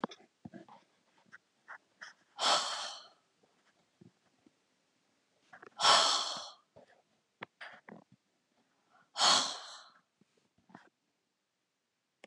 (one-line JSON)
{"exhalation_length": "12.3 s", "exhalation_amplitude": 8634, "exhalation_signal_mean_std_ratio": 0.28, "survey_phase": "beta (2021-08-13 to 2022-03-07)", "age": "65+", "gender": "Female", "wearing_mask": "No", "symptom_runny_or_blocked_nose": true, "smoker_status": "Ex-smoker", "respiratory_condition_asthma": false, "respiratory_condition_other": false, "recruitment_source": "REACT", "submission_delay": "3 days", "covid_test_result": "Negative", "covid_test_method": "RT-qPCR", "influenza_a_test_result": "Negative", "influenza_b_test_result": "Negative"}